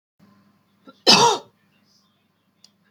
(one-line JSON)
{"cough_length": "2.9 s", "cough_amplitude": 31708, "cough_signal_mean_std_ratio": 0.26, "survey_phase": "beta (2021-08-13 to 2022-03-07)", "age": "45-64", "gender": "Female", "wearing_mask": "No", "symptom_none": true, "smoker_status": "Ex-smoker", "respiratory_condition_asthma": false, "respiratory_condition_other": false, "recruitment_source": "REACT", "submission_delay": "2 days", "covid_test_result": "Negative", "covid_test_method": "RT-qPCR", "influenza_a_test_result": "Negative", "influenza_b_test_result": "Negative"}